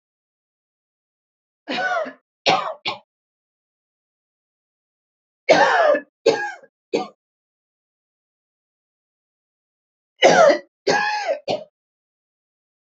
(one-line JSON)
{"three_cough_length": "12.9 s", "three_cough_amplitude": 27598, "three_cough_signal_mean_std_ratio": 0.33, "survey_phase": "beta (2021-08-13 to 2022-03-07)", "age": "45-64", "gender": "Female", "wearing_mask": "No", "symptom_runny_or_blocked_nose": true, "smoker_status": "Never smoked", "respiratory_condition_asthma": true, "respiratory_condition_other": false, "recruitment_source": "REACT", "submission_delay": "1 day", "covid_test_result": "Negative", "covid_test_method": "RT-qPCR", "influenza_a_test_result": "Unknown/Void", "influenza_b_test_result": "Unknown/Void"}